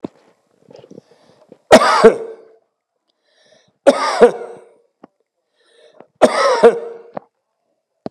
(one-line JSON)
{"three_cough_length": "8.1 s", "three_cough_amplitude": 32768, "three_cough_signal_mean_std_ratio": 0.32, "survey_phase": "beta (2021-08-13 to 2022-03-07)", "age": "65+", "gender": "Male", "wearing_mask": "No", "symptom_none": true, "smoker_status": "Never smoked", "respiratory_condition_asthma": false, "respiratory_condition_other": false, "recruitment_source": "REACT", "submission_delay": "3 days", "covid_test_result": "Negative", "covid_test_method": "RT-qPCR", "influenza_a_test_result": "Unknown/Void", "influenza_b_test_result": "Unknown/Void"}